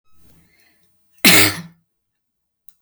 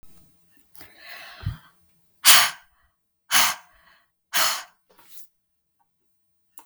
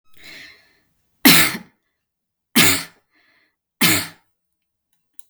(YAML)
cough_length: 2.8 s
cough_amplitude: 32768
cough_signal_mean_std_ratio: 0.27
exhalation_length: 6.7 s
exhalation_amplitude: 32768
exhalation_signal_mean_std_ratio: 0.27
three_cough_length: 5.3 s
three_cough_amplitude: 32768
three_cough_signal_mean_std_ratio: 0.31
survey_phase: beta (2021-08-13 to 2022-03-07)
age: 45-64
gender: Female
wearing_mask: 'No'
symptom_none: true
smoker_status: Never smoked
respiratory_condition_asthma: false
respiratory_condition_other: false
recruitment_source: REACT
submission_delay: 1 day
covid_test_result: Negative
covid_test_method: RT-qPCR
influenza_a_test_result: Negative
influenza_b_test_result: Negative